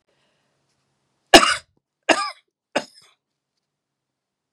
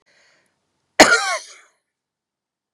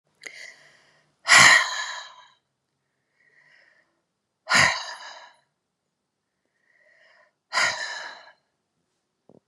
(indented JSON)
{
  "three_cough_length": "4.5 s",
  "three_cough_amplitude": 32768,
  "three_cough_signal_mean_std_ratio": 0.19,
  "cough_length": "2.7 s",
  "cough_amplitude": 32768,
  "cough_signal_mean_std_ratio": 0.25,
  "exhalation_length": "9.5 s",
  "exhalation_amplitude": 31804,
  "exhalation_signal_mean_std_ratio": 0.27,
  "survey_phase": "beta (2021-08-13 to 2022-03-07)",
  "age": "65+",
  "gender": "Female",
  "wearing_mask": "No",
  "symptom_none": true,
  "smoker_status": "Never smoked",
  "respiratory_condition_asthma": false,
  "respiratory_condition_other": false,
  "recruitment_source": "REACT",
  "submission_delay": "2 days",
  "covid_test_result": "Negative",
  "covid_test_method": "RT-qPCR",
  "influenza_a_test_result": "Negative",
  "influenza_b_test_result": "Negative"
}